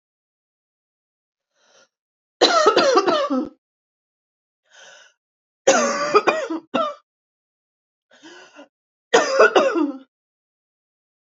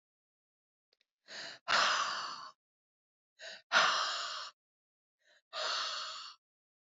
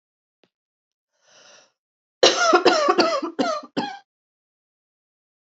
three_cough_length: 11.3 s
three_cough_amplitude: 27976
three_cough_signal_mean_std_ratio: 0.38
exhalation_length: 7.0 s
exhalation_amplitude: 7395
exhalation_signal_mean_std_ratio: 0.42
cough_length: 5.5 s
cough_amplitude: 28180
cough_signal_mean_std_ratio: 0.37
survey_phase: alpha (2021-03-01 to 2021-08-12)
age: 45-64
gender: Female
wearing_mask: 'No'
symptom_cough_any: true
symptom_fatigue: true
symptom_headache: true
symptom_onset: 7 days
smoker_status: Ex-smoker
respiratory_condition_asthma: false
respiratory_condition_other: false
recruitment_source: Test and Trace
submission_delay: 2 days
covid_test_result: Positive
covid_test_method: RT-qPCR
covid_ct_value: 16.3
covid_ct_gene: N gene
covid_ct_mean: 16.4
covid_viral_load: 4200000 copies/ml
covid_viral_load_category: High viral load (>1M copies/ml)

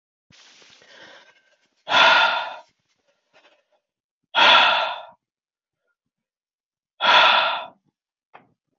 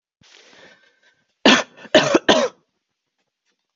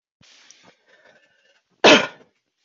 exhalation_length: 8.8 s
exhalation_amplitude: 26374
exhalation_signal_mean_std_ratio: 0.36
three_cough_length: 3.8 s
three_cough_amplitude: 30496
three_cough_signal_mean_std_ratio: 0.31
cough_length: 2.6 s
cough_amplitude: 28545
cough_signal_mean_std_ratio: 0.22
survey_phase: beta (2021-08-13 to 2022-03-07)
age: 18-44
gender: Female
wearing_mask: 'No'
symptom_none: true
smoker_status: Never smoked
respiratory_condition_asthma: false
respiratory_condition_other: false
recruitment_source: REACT
submission_delay: 1 day
covid_test_result: Negative
covid_test_method: RT-qPCR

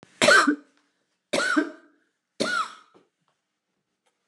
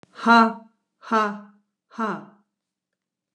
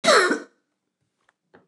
three_cough_length: 4.3 s
three_cough_amplitude: 20096
three_cough_signal_mean_std_ratio: 0.36
exhalation_length: 3.3 s
exhalation_amplitude: 20600
exhalation_signal_mean_std_ratio: 0.34
cough_length: 1.7 s
cough_amplitude: 21036
cough_signal_mean_std_ratio: 0.36
survey_phase: beta (2021-08-13 to 2022-03-07)
age: 65+
gender: Female
wearing_mask: 'No'
symptom_none: true
smoker_status: Never smoked
respiratory_condition_asthma: false
respiratory_condition_other: false
recruitment_source: REACT
submission_delay: 3 days
covid_test_result: Negative
covid_test_method: RT-qPCR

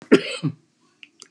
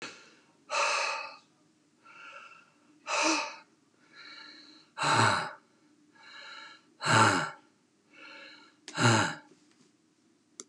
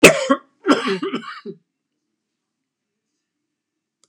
cough_length: 1.3 s
cough_amplitude: 31461
cough_signal_mean_std_ratio: 0.29
exhalation_length: 10.7 s
exhalation_amplitude: 11205
exhalation_signal_mean_std_ratio: 0.4
three_cough_length: 4.1 s
three_cough_amplitude: 32768
three_cough_signal_mean_std_ratio: 0.28
survey_phase: beta (2021-08-13 to 2022-03-07)
age: 65+
gender: Male
wearing_mask: 'No'
symptom_none: true
smoker_status: Never smoked
respiratory_condition_asthma: false
respiratory_condition_other: false
recruitment_source: REACT
submission_delay: 9 days
covid_test_result: Negative
covid_test_method: RT-qPCR
influenza_a_test_result: Negative
influenza_b_test_result: Negative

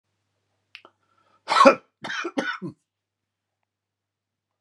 cough_length: 4.6 s
cough_amplitude: 32767
cough_signal_mean_std_ratio: 0.23
survey_phase: beta (2021-08-13 to 2022-03-07)
age: 45-64
gender: Male
wearing_mask: 'No'
symptom_none: true
smoker_status: Never smoked
recruitment_source: REACT
submission_delay: 1 day
covid_test_result: Negative
covid_test_method: RT-qPCR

